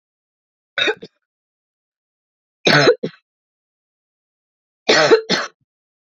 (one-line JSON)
{"three_cough_length": "6.1 s", "three_cough_amplitude": 28561, "three_cough_signal_mean_std_ratio": 0.31, "survey_phase": "beta (2021-08-13 to 2022-03-07)", "age": "18-44", "gender": "Female", "wearing_mask": "No", "symptom_cough_any": true, "symptom_new_continuous_cough": true, "symptom_runny_or_blocked_nose": true, "symptom_shortness_of_breath": true, "symptom_sore_throat": true, "symptom_fatigue": true, "symptom_headache": true, "symptom_onset": "4 days", "smoker_status": "Never smoked", "respiratory_condition_asthma": true, "respiratory_condition_other": false, "recruitment_source": "Test and Trace", "submission_delay": "1 day", "covid_test_result": "Positive", "covid_test_method": "ePCR"}